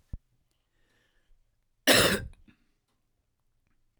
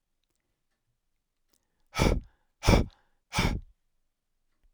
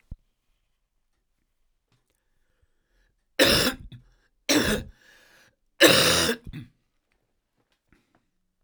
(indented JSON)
{
  "cough_length": "4.0 s",
  "cough_amplitude": 16995,
  "cough_signal_mean_std_ratio": 0.24,
  "exhalation_length": "4.7 s",
  "exhalation_amplitude": 16207,
  "exhalation_signal_mean_std_ratio": 0.28,
  "three_cough_length": "8.6 s",
  "three_cough_amplitude": 32767,
  "three_cough_signal_mean_std_ratio": 0.3,
  "survey_phase": "beta (2021-08-13 to 2022-03-07)",
  "age": "45-64",
  "gender": "Male",
  "wearing_mask": "No",
  "symptom_cough_any": true,
  "symptom_runny_or_blocked_nose": true,
  "symptom_sore_throat": true,
  "symptom_fatigue": true,
  "symptom_change_to_sense_of_smell_or_taste": true,
  "smoker_status": "Never smoked",
  "respiratory_condition_asthma": false,
  "respiratory_condition_other": false,
  "recruitment_source": "Test and Trace",
  "submission_delay": "2 days",
  "covid_test_result": "Positive",
  "covid_test_method": "RT-qPCR",
  "covid_ct_value": 13.5,
  "covid_ct_gene": "ORF1ab gene",
  "covid_ct_mean": 14.5,
  "covid_viral_load": "18000000 copies/ml",
  "covid_viral_load_category": "High viral load (>1M copies/ml)"
}